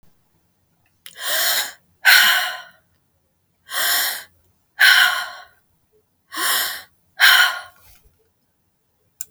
{"exhalation_length": "9.3 s", "exhalation_amplitude": 32768, "exhalation_signal_mean_std_ratio": 0.41, "survey_phase": "beta (2021-08-13 to 2022-03-07)", "age": "65+", "gender": "Female", "wearing_mask": "No", "symptom_none": true, "symptom_onset": "13 days", "smoker_status": "Ex-smoker", "respiratory_condition_asthma": false, "respiratory_condition_other": false, "recruitment_source": "REACT", "submission_delay": "1 day", "covid_test_result": "Negative", "covid_test_method": "RT-qPCR"}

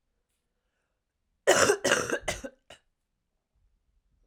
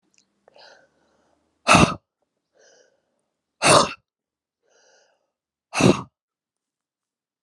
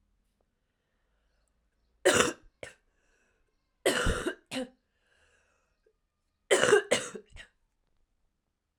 {"cough_length": "4.3 s", "cough_amplitude": 17889, "cough_signal_mean_std_ratio": 0.3, "exhalation_length": "7.4 s", "exhalation_amplitude": 31481, "exhalation_signal_mean_std_ratio": 0.24, "three_cough_length": "8.8 s", "three_cough_amplitude": 15457, "three_cough_signal_mean_std_ratio": 0.29, "survey_phase": "alpha (2021-03-01 to 2021-08-12)", "age": "18-44", "gender": "Female", "wearing_mask": "No", "symptom_cough_any": true, "symptom_fatigue": true, "symptom_onset": "3 days", "smoker_status": "Never smoked", "respiratory_condition_asthma": false, "respiratory_condition_other": false, "recruitment_source": "Test and Trace", "submission_delay": "1 day", "covid_test_result": "Positive", "covid_test_method": "RT-qPCR", "covid_ct_value": 24.9, "covid_ct_gene": "ORF1ab gene"}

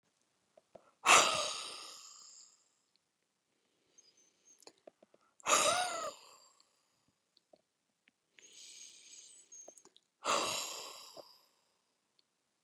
{"exhalation_length": "12.6 s", "exhalation_amplitude": 10036, "exhalation_signal_mean_std_ratio": 0.28, "survey_phase": "beta (2021-08-13 to 2022-03-07)", "age": "45-64", "gender": "Female", "wearing_mask": "No", "symptom_runny_or_blocked_nose": true, "symptom_fatigue": true, "smoker_status": "Ex-smoker", "respiratory_condition_asthma": true, "respiratory_condition_other": false, "recruitment_source": "REACT", "submission_delay": "0 days", "covid_test_result": "Negative", "covid_test_method": "RT-qPCR"}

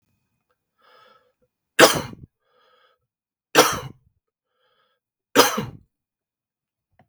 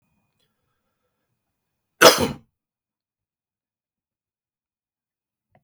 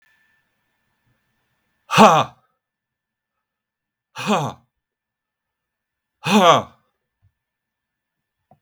{"three_cough_length": "7.1 s", "three_cough_amplitude": 32768, "three_cough_signal_mean_std_ratio": 0.22, "cough_length": "5.6 s", "cough_amplitude": 32768, "cough_signal_mean_std_ratio": 0.15, "exhalation_length": "8.6 s", "exhalation_amplitude": 32768, "exhalation_signal_mean_std_ratio": 0.25, "survey_phase": "beta (2021-08-13 to 2022-03-07)", "age": "45-64", "gender": "Male", "wearing_mask": "No", "symptom_fatigue": true, "smoker_status": "Ex-smoker", "respiratory_condition_asthma": false, "respiratory_condition_other": false, "recruitment_source": "REACT", "submission_delay": "1 day", "covid_test_result": "Negative", "covid_test_method": "RT-qPCR"}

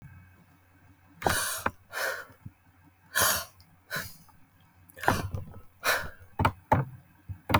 {"exhalation_length": "7.6 s", "exhalation_amplitude": 15354, "exhalation_signal_mean_std_ratio": 0.43, "survey_phase": "beta (2021-08-13 to 2022-03-07)", "age": "45-64", "gender": "Female", "wearing_mask": "No", "symptom_none": true, "smoker_status": "Never smoked", "respiratory_condition_asthma": false, "respiratory_condition_other": false, "recruitment_source": "REACT", "submission_delay": "3 days", "covid_test_result": "Negative", "covid_test_method": "RT-qPCR", "influenza_a_test_result": "Negative", "influenza_b_test_result": "Negative"}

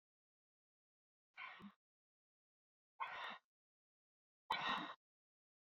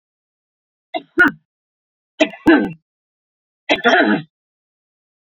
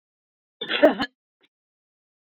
{"exhalation_length": "5.6 s", "exhalation_amplitude": 1293, "exhalation_signal_mean_std_ratio": 0.31, "three_cough_length": "5.4 s", "three_cough_amplitude": 31400, "three_cough_signal_mean_std_ratio": 0.33, "cough_length": "2.3 s", "cough_amplitude": 23137, "cough_signal_mean_std_ratio": 0.25, "survey_phase": "beta (2021-08-13 to 2022-03-07)", "age": "45-64", "gender": "Female", "wearing_mask": "No", "symptom_none": true, "smoker_status": "Current smoker (1 to 10 cigarettes per day)", "respiratory_condition_asthma": false, "respiratory_condition_other": false, "recruitment_source": "REACT", "submission_delay": "1 day", "covid_test_result": "Negative", "covid_test_method": "RT-qPCR"}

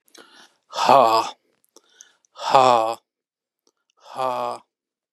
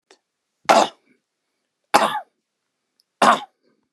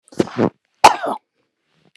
{"exhalation_length": "5.1 s", "exhalation_amplitude": 32635, "exhalation_signal_mean_std_ratio": 0.35, "three_cough_length": "3.9 s", "three_cough_amplitude": 32768, "three_cough_signal_mean_std_ratio": 0.28, "cough_length": "2.0 s", "cough_amplitude": 32768, "cough_signal_mean_std_ratio": 0.29, "survey_phase": "beta (2021-08-13 to 2022-03-07)", "age": "45-64", "gender": "Male", "wearing_mask": "No", "symptom_runny_or_blocked_nose": true, "smoker_status": "Never smoked", "respiratory_condition_asthma": false, "respiratory_condition_other": false, "recruitment_source": "REACT", "submission_delay": "2 days", "covid_test_result": "Negative", "covid_test_method": "RT-qPCR", "influenza_a_test_result": "Negative", "influenza_b_test_result": "Negative"}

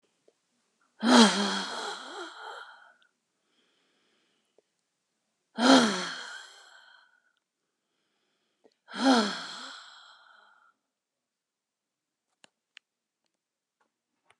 {"exhalation_length": "14.4 s", "exhalation_amplitude": 20685, "exhalation_signal_mean_std_ratio": 0.27, "survey_phase": "beta (2021-08-13 to 2022-03-07)", "age": "65+", "gender": "Female", "wearing_mask": "No", "symptom_cough_any": true, "symptom_shortness_of_breath": true, "symptom_fatigue": true, "symptom_onset": "12 days", "smoker_status": "Never smoked", "respiratory_condition_asthma": false, "respiratory_condition_other": true, "recruitment_source": "REACT", "submission_delay": "3 days", "covid_test_result": "Negative", "covid_test_method": "RT-qPCR", "influenza_a_test_result": "Negative", "influenza_b_test_result": "Negative"}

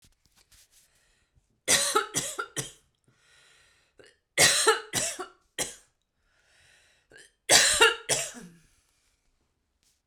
{"three_cough_length": "10.1 s", "three_cough_amplitude": 21292, "three_cough_signal_mean_std_ratio": 0.33, "survey_phase": "beta (2021-08-13 to 2022-03-07)", "age": "45-64", "gender": "Female", "wearing_mask": "No", "symptom_none": true, "smoker_status": "Never smoked", "respiratory_condition_asthma": false, "respiratory_condition_other": false, "recruitment_source": "REACT", "submission_delay": "0 days", "covid_test_result": "Negative", "covid_test_method": "RT-qPCR"}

